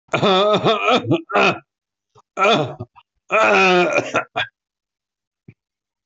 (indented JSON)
{
  "three_cough_length": "6.1 s",
  "three_cough_amplitude": 22976,
  "three_cough_signal_mean_std_ratio": 0.57,
  "survey_phase": "beta (2021-08-13 to 2022-03-07)",
  "age": "45-64",
  "gender": "Male",
  "wearing_mask": "No",
  "symptom_none": true,
  "smoker_status": "Ex-smoker",
  "respiratory_condition_asthma": false,
  "respiratory_condition_other": false,
  "recruitment_source": "REACT",
  "submission_delay": "4 days",
  "covid_test_result": "Negative",
  "covid_test_method": "RT-qPCR"
}